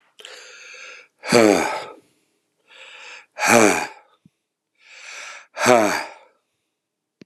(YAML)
exhalation_length: 7.3 s
exhalation_amplitude: 32768
exhalation_signal_mean_std_ratio: 0.35
survey_phase: alpha (2021-03-01 to 2021-08-12)
age: 65+
gender: Male
wearing_mask: 'No'
symptom_cough_any: true
symptom_fatigue: true
symptom_change_to_sense_of_smell_or_taste: true
symptom_loss_of_taste: true
symptom_onset: 9 days
smoker_status: Ex-smoker
respiratory_condition_asthma: false
respiratory_condition_other: false
recruitment_source: Test and Trace
submission_delay: 2 days
covid_test_result: Positive
covid_test_method: RT-qPCR
covid_ct_value: 22.1
covid_ct_gene: N gene
covid_ct_mean: 22.4
covid_viral_load: 46000 copies/ml
covid_viral_load_category: Low viral load (10K-1M copies/ml)